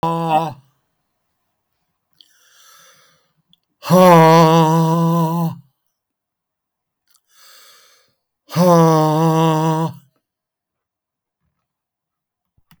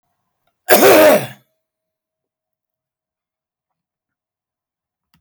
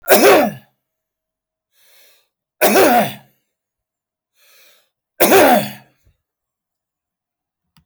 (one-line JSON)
{"exhalation_length": "12.8 s", "exhalation_amplitude": 32766, "exhalation_signal_mean_std_ratio": 0.42, "cough_length": "5.2 s", "cough_amplitude": 32766, "cough_signal_mean_std_ratio": 0.29, "three_cough_length": "7.9 s", "three_cough_amplitude": 32768, "three_cough_signal_mean_std_ratio": 0.37, "survey_phase": "beta (2021-08-13 to 2022-03-07)", "age": "65+", "gender": "Male", "wearing_mask": "No", "symptom_runny_or_blocked_nose": true, "symptom_onset": "7 days", "smoker_status": "Never smoked", "respiratory_condition_asthma": true, "respiratory_condition_other": false, "recruitment_source": "Test and Trace", "submission_delay": "1 day", "covid_test_result": "Positive", "covid_test_method": "RT-qPCR", "covid_ct_value": 29.8, "covid_ct_gene": "ORF1ab gene", "covid_ct_mean": 30.2, "covid_viral_load": "120 copies/ml", "covid_viral_load_category": "Minimal viral load (< 10K copies/ml)"}